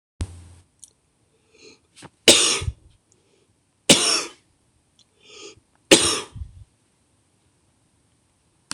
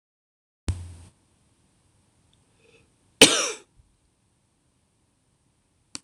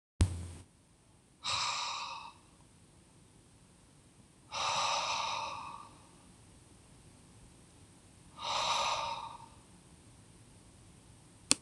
three_cough_length: 8.7 s
three_cough_amplitude: 26028
three_cough_signal_mean_std_ratio: 0.26
cough_length: 6.0 s
cough_amplitude: 26028
cough_signal_mean_std_ratio: 0.17
exhalation_length: 11.6 s
exhalation_amplitude: 18639
exhalation_signal_mean_std_ratio: 0.46
survey_phase: alpha (2021-03-01 to 2021-08-12)
age: 45-64
gender: Male
wearing_mask: 'No'
symptom_cough_any: true
symptom_change_to_sense_of_smell_or_taste: true
symptom_onset: 4 days
smoker_status: Ex-smoker
respiratory_condition_asthma: false
respiratory_condition_other: false
recruitment_source: Test and Trace
submission_delay: 2 days
covid_test_result: Positive
covid_test_method: RT-qPCR
covid_ct_value: 24.5
covid_ct_gene: N gene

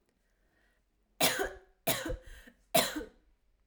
three_cough_length: 3.7 s
three_cough_amplitude: 10963
three_cough_signal_mean_std_ratio: 0.37
survey_phase: alpha (2021-03-01 to 2021-08-12)
age: 18-44
gender: Female
wearing_mask: 'No'
symptom_cough_any: true
symptom_fatigue: true
symptom_change_to_sense_of_smell_or_taste: true
symptom_loss_of_taste: true
smoker_status: Never smoked
respiratory_condition_asthma: false
respiratory_condition_other: false
recruitment_source: Test and Trace
submission_delay: 3 days
covid_test_method: RT-qPCR
covid_ct_value: 38.1
covid_ct_gene: N gene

